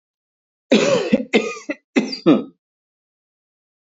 {"cough_length": "3.8 s", "cough_amplitude": 25775, "cough_signal_mean_std_ratio": 0.4, "survey_phase": "beta (2021-08-13 to 2022-03-07)", "age": "45-64", "gender": "Male", "wearing_mask": "No", "symptom_none": true, "smoker_status": "Never smoked", "respiratory_condition_asthma": false, "respiratory_condition_other": false, "recruitment_source": "REACT", "submission_delay": "3 days", "covid_test_result": "Negative", "covid_test_method": "RT-qPCR", "influenza_a_test_result": "Negative", "influenza_b_test_result": "Negative"}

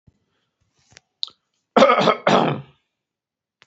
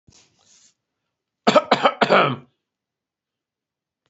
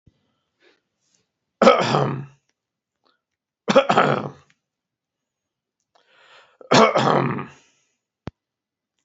{"exhalation_length": "3.7 s", "exhalation_amplitude": 32767, "exhalation_signal_mean_std_ratio": 0.33, "cough_length": "4.1 s", "cough_amplitude": 32464, "cough_signal_mean_std_ratio": 0.29, "three_cough_length": "9.0 s", "three_cough_amplitude": 32767, "three_cough_signal_mean_std_ratio": 0.32, "survey_phase": "alpha (2021-03-01 to 2021-08-12)", "age": "45-64", "gender": "Male", "wearing_mask": "No", "symptom_none": true, "smoker_status": "Never smoked", "respiratory_condition_asthma": false, "respiratory_condition_other": false, "recruitment_source": "REACT", "submission_delay": "2 days", "covid_test_result": "Negative", "covid_test_method": "RT-qPCR"}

